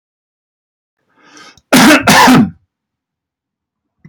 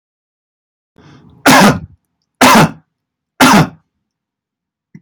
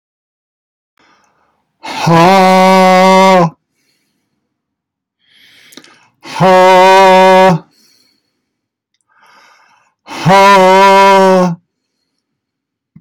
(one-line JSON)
{"cough_length": "4.1 s", "cough_amplitude": 32768, "cough_signal_mean_std_ratio": 0.4, "three_cough_length": "5.0 s", "three_cough_amplitude": 32768, "three_cough_signal_mean_std_ratio": 0.38, "exhalation_length": "13.0 s", "exhalation_amplitude": 32768, "exhalation_signal_mean_std_ratio": 0.57, "survey_phase": "beta (2021-08-13 to 2022-03-07)", "age": "65+", "gender": "Male", "wearing_mask": "No", "symptom_none": true, "smoker_status": "Never smoked", "respiratory_condition_asthma": false, "respiratory_condition_other": false, "recruitment_source": "REACT", "submission_delay": "3 days", "covid_test_result": "Negative", "covid_test_method": "RT-qPCR"}